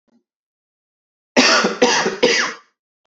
{"three_cough_length": "3.1 s", "three_cough_amplitude": 32768, "three_cough_signal_mean_std_ratio": 0.47, "survey_phase": "beta (2021-08-13 to 2022-03-07)", "age": "45-64", "gender": "Male", "wearing_mask": "No", "symptom_cough_any": true, "symptom_runny_or_blocked_nose": true, "symptom_sore_throat": true, "symptom_fatigue": true, "symptom_headache": true, "symptom_change_to_sense_of_smell_or_taste": true, "smoker_status": "Ex-smoker", "respiratory_condition_asthma": false, "respiratory_condition_other": false, "recruitment_source": "Test and Trace", "submission_delay": "2 days", "covid_test_result": "Positive", "covid_test_method": "RT-qPCR"}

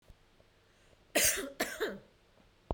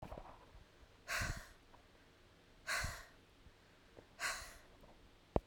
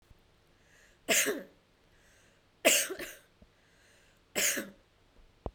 {"cough_length": "2.7 s", "cough_amplitude": 6376, "cough_signal_mean_std_ratio": 0.39, "exhalation_length": "5.5 s", "exhalation_amplitude": 6222, "exhalation_signal_mean_std_ratio": 0.43, "three_cough_length": "5.5 s", "three_cough_amplitude": 11107, "three_cough_signal_mean_std_ratio": 0.33, "survey_phase": "beta (2021-08-13 to 2022-03-07)", "age": "45-64", "gender": "Female", "wearing_mask": "No", "symptom_none": true, "smoker_status": "Never smoked", "respiratory_condition_asthma": false, "respiratory_condition_other": false, "recruitment_source": "REACT", "submission_delay": "2 days", "covid_test_result": "Negative", "covid_test_method": "RT-qPCR", "influenza_a_test_result": "Negative", "influenza_b_test_result": "Negative"}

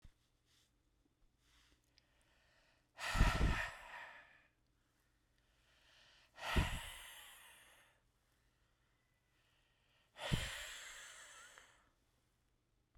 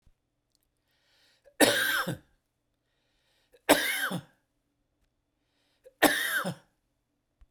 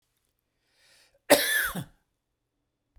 {"exhalation_length": "13.0 s", "exhalation_amplitude": 3798, "exhalation_signal_mean_std_ratio": 0.3, "three_cough_length": "7.5 s", "three_cough_amplitude": 22159, "three_cough_signal_mean_std_ratio": 0.32, "cough_length": "3.0 s", "cough_amplitude": 20189, "cough_signal_mean_std_ratio": 0.28, "survey_phase": "beta (2021-08-13 to 2022-03-07)", "age": "65+", "gender": "Male", "wearing_mask": "No", "symptom_none": true, "smoker_status": "Never smoked", "respiratory_condition_asthma": false, "respiratory_condition_other": false, "recruitment_source": "Test and Trace", "submission_delay": "2 days", "covid_test_result": "Positive", "covid_test_method": "RT-qPCR", "covid_ct_value": 27.6, "covid_ct_gene": "ORF1ab gene"}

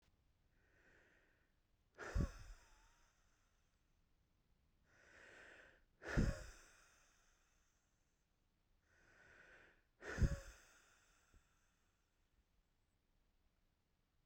{"exhalation_length": "14.3 s", "exhalation_amplitude": 1794, "exhalation_signal_mean_std_ratio": 0.23, "survey_phase": "beta (2021-08-13 to 2022-03-07)", "age": "18-44", "gender": "Male", "wearing_mask": "No", "symptom_runny_or_blocked_nose": true, "symptom_fatigue": true, "symptom_onset": "13 days", "smoker_status": "Ex-smoker", "respiratory_condition_asthma": false, "respiratory_condition_other": false, "recruitment_source": "REACT", "submission_delay": "1 day", "covid_test_result": "Negative", "covid_test_method": "RT-qPCR", "influenza_a_test_result": "Unknown/Void", "influenza_b_test_result": "Unknown/Void"}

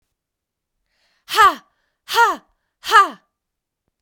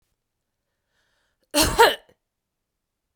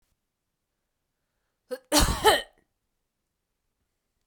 {"exhalation_length": "4.0 s", "exhalation_amplitude": 32767, "exhalation_signal_mean_std_ratio": 0.31, "three_cough_length": "3.2 s", "three_cough_amplitude": 22885, "three_cough_signal_mean_std_ratio": 0.25, "cough_length": "4.3 s", "cough_amplitude": 17172, "cough_signal_mean_std_ratio": 0.25, "survey_phase": "beta (2021-08-13 to 2022-03-07)", "age": "45-64", "gender": "Female", "wearing_mask": "No", "symptom_runny_or_blocked_nose": true, "symptom_sore_throat": true, "symptom_fatigue": true, "symptom_headache": true, "symptom_onset": "3 days", "smoker_status": "Ex-smoker", "respiratory_condition_asthma": false, "respiratory_condition_other": false, "recruitment_source": "Test and Trace", "submission_delay": "2 days", "covid_test_result": "Positive", "covid_test_method": "RT-qPCR"}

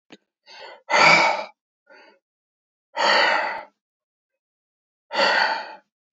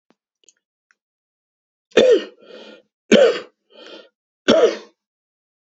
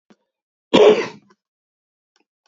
{"exhalation_length": "6.1 s", "exhalation_amplitude": 25913, "exhalation_signal_mean_std_ratio": 0.42, "three_cough_length": "5.6 s", "three_cough_amplitude": 32768, "three_cough_signal_mean_std_ratio": 0.31, "cough_length": "2.5 s", "cough_amplitude": 27791, "cough_signal_mean_std_ratio": 0.28, "survey_phase": "beta (2021-08-13 to 2022-03-07)", "age": "65+", "gender": "Male", "wearing_mask": "No", "symptom_prefer_not_to_say": true, "symptom_onset": "5 days", "smoker_status": "Never smoked", "respiratory_condition_asthma": false, "respiratory_condition_other": false, "recruitment_source": "Test and Trace", "submission_delay": "1 day", "covid_test_result": "Negative", "covid_test_method": "RT-qPCR"}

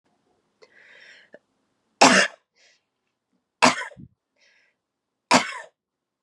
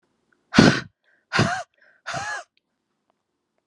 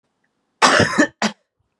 {"three_cough_length": "6.2 s", "three_cough_amplitude": 32375, "three_cough_signal_mean_std_ratio": 0.23, "exhalation_length": "3.7 s", "exhalation_amplitude": 32768, "exhalation_signal_mean_std_ratio": 0.3, "cough_length": "1.8 s", "cough_amplitude": 32643, "cough_signal_mean_std_ratio": 0.42, "survey_phase": "beta (2021-08-13 to 2022-03-07)", "age": "18-44", "gender": "Female", "wearing_mask": "No", "symptom_cough_any": true, "symptom_runny_or_blocked_nose": true, "symptom_sore_throat": true, "symptom_fatigue": true, "symptom_change_to_sense_of_smell_or_taste": true, "symptom_onset": "9 days", "smoker_status": "Current smoker (1 to 10 cigarettes per day)", "respiratory_condition_asthma": false, "respiratory_condition_other": false, "recruitment_source": "Test and Trace", "submission_delay": "2 days", "covid_test_result": "Positive", "covid_test_method": "RT-qPCR"}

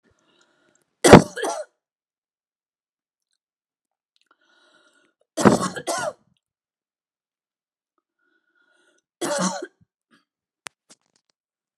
{"three_cough_length": "11.8 s", "three_cough_amplitude": 32768, "three_cough_signal_mean_std_ratio": 0.18, "survey_phase": "alpha (2021-03-01 to 2021-08-12)", "age": "45-64", "gender": "Female", "wearing_mask": "No", "symptom_none": true, "smoker_status": "Never smoked", "respiratory_condition_asthma": false, "respiratory_condition_other": false, "recruitment_source": "REACT", "submission_delay": "3 days", "covid_test_result": "Negative", "covid_test_method": "RT-qPCR"}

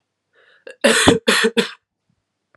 {"three_cough_length": "2.6 s", "three_cough_amplitude": 32767, "three_cough_signal_mean_std_ratio": 0.41, "survey_phase": "alpha (2021-03-01 to 2021-08-12)", "age": "18-44", "gender": "Female", "wearing_mask": "No", "symptom_new_continuous_cough": true, "symptom_fatigue": true, "symptom_headache": true, "smoker_status": "Never smoked", "respiratory_condition_asthma": true, "respiratory_condition_other": false, "recruitment_source": "Test and Trace", "submission_delay": "1 day", "covid_test_result": "Positive", "covid_test_method": "RT-qPCR", "covid_ct_value": 28.6, "covid_ct_gene": "ORF1ab gene"}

